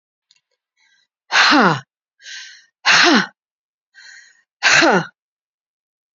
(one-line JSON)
{"exhalation_length": "6.1 s", "exhalation_amplitude": 31322, "exhalation_signal_mean_std_ratio": 0.38, "survey_phase": "beta (2021-08-13 to 2022-03-07)", "age": "45-64", "gender": "Female", "wearing_mask": "No", "symptom_none": true, "smoker_status": "Never smoked", "respiratory_condition_asthma": false, "respiratory_condition_other": false, "recruitment_source": "REACT", "submission_delay": "1 day", "covid_test_result": "Negative", "covid_test_method": "RT-qPCR", "influenza_a_test_result": "Negative", "influenza_b_test_result": "Negative"}